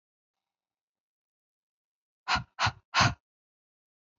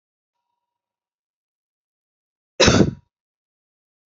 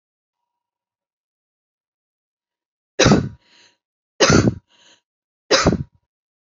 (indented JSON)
{
  "exhalation_length": "4.2 s",
  "exhalation_amplitude": 9693,
  "exhalation_signal_mean_std_ratio": 0.24,
  "cough_length": "4.2 s",
  "cough_amplitude": 29170,
  "cough_signal_mean_std_ratio": 0.21,
  "three_cough_length": "6.5 s",
  "three_cough_amplitude": 28629,
  "three_cough_signal_mean_std_ratio": 0.28,
  "survey_phase": "alpha (2021-03-01 to 2021-08-12)",
  "age": "18-44",
  "gender": "Female",
  "wearing_mask": "No",
  "symptom_fatigue": true,
  "smoker_status": "Ex-smoker",
  "respiratory_condition_asthma": false,
  "respiratory_condition_other": false,
  "recruitment_source": "REACT",
  "submission_delay": "1 day",
  "covid_test_result": "Negative",
  "covid_test_method": "RT-qPCR"
}